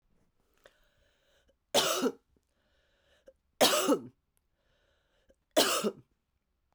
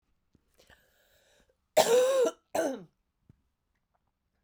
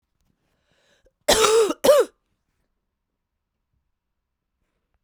{
  "three_cough_length": "6.7 s",
  "three_cough_amplitude": 12808,
  "three_cough_signal_mean_std_ratio": 0.31,
  "cough_length": "4.4 s",
  "cough_amplitude": 13346,
  "cough_signal_mean_std_ratio": 0.34,
  "exhalation_length": "5.0 s",
  "exhalation_amplitude": 26669,
  "exhalation_signal_mean_std_ratio": 0.3,
  "survey_phase": "beta (2021-08-13 to 2022-03-07)",
  "age": "45-64",
  "gender": "Female",
  "wearing_mask": "No",
  "symptom_cough_any": true,
  "symptom_new_continuous_cough": true,
  "symptom_runny_or_blocked_nose": true,
  "symptom_fatigue": true,
  "symptom_headache": true,
  "symptom_change_to_sense_of_smell_or_taste": true,
  "symptom_loss_of_taste": true,
  "symptom_onset": "4 days",
  "smoker_status": "Ex-smoker",
  "respiratory_condition_asthma": false,
  "respiratory_condition_other": false,
  "recruitment_source": "Test and Trace",
  "submission_delay": "2 days",
  "covid_test_result": "Positive",
  "covid_test_method": "LAMP"
}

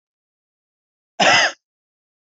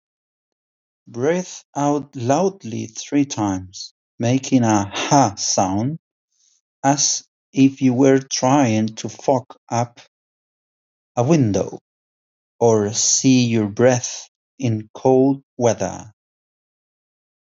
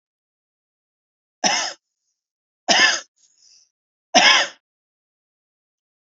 {
  "cough_length": "2.4 s",
  "cough_amplitude": 26190,
  "cough_signal_mean_std_ratio": 0.29,
  "exhalation_length": "17.6 s",
  "exhalation_amplitude": 28044,
  "exhalation_signal_mean_std_ratio": 0.54,
  "three_cough_length": "6.1 s",
  "three_cough_amplitude": 32768,
  "three_cough_signal_mean_std_ratio": 0.29,
  "survey_phase": "beta (2021-08-13 to 2022-03-07)",
  "age": "18-44",
  "gender": "Male",
  "wearing_mask": "No",
  "symptom_none": true,
  "smoker_status": "Never smoked",
  "respiratory_condition_asthma": false,
  "respiratory_condition_other": false,
  "recruitment_source": "Test and Trace",
  "submission_delay": "0 days",
  "covid_test_result": "Negative",
  "covid_test_method": "LFT"
}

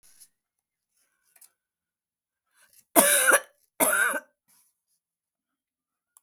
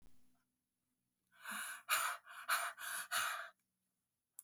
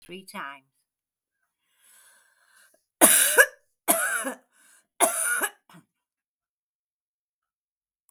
{
  "cough_length": "6.2 s",
  "cough_amplitude": 32768,
  "cough_signal_mean_std_ratio": 0.28,
  "exhalation_length": "4.4 s",
  "exhalation_amplitude": 2653,
  "exhalation_signal_mean_std_ratio": 0.48,
  "three_cough_length": "8.1 s",
  "three_cough_amplitude": 32768,
  "three_cough_signal_mean_std_ratio": 0.29,
  "survey_phase": "beta (2021-08-13 to 2022-03-07)",
  "age": "65+",
  "gender": "Female",
  "wearing_mask": "No",
  "symptom_none": true,
  "smoker_status": "Ex-smoker",
  "respiratory_condition_asthma": false,
  "respiratory_condition_other": true,
  "recruitment_source": "REACT",
  "submission_delay": "11 days",
  "covid_test_result": "Negative",
  "covid_test_method": "RT-qPCR"
}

